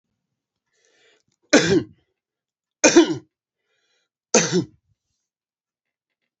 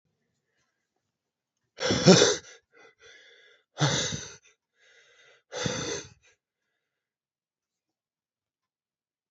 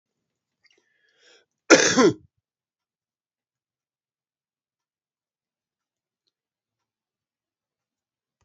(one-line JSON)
{"three_cough_length": "6.4 s", "three_cough_amplitude": 31016, "three_cough_signal_mean_std_ratio": 0.27, "exhalation_length": "9.3 s", "exhalation_amplitude": 31170, "exhalation_signal_mean_std_ratio": 0.25, "cough_length": "8.4 s", "cough_amplitude": 32767, "cough_signal_mean_std_ratio": 0.16, "survey_phase": "beta (2021-08-13 to 2022-03-07)", "age": "45-64", "gender": "Male", "wearing_mask": "No", "symptom_new_continuous_cough": true, "symptom_runny_or_blocked_nose": true, "symptom_shortness_of_breath": true, "symptom_abdominal_pain": true, "symptom_diarrhoea": true, "symptom_fatigue": true, "symptom_headache": true, "symptom_change_to_sense_of_smell_or_taste": true, "symptom_loss_of_taste": true, "symptom_onset": "12 days", "smoker_status": "Ex-smoker", "respiratory_condition_asthma": false, "respiratory_condition_other": false, "recruitment_source": "REACT", "submission_delay": "2 days", "covid_test_result": "Negative", "covid_test_method": "RT-qPCR", "influenza_a_test_result": "Unknown/Void", "influenza_b_test_result": "Unknown/Void"}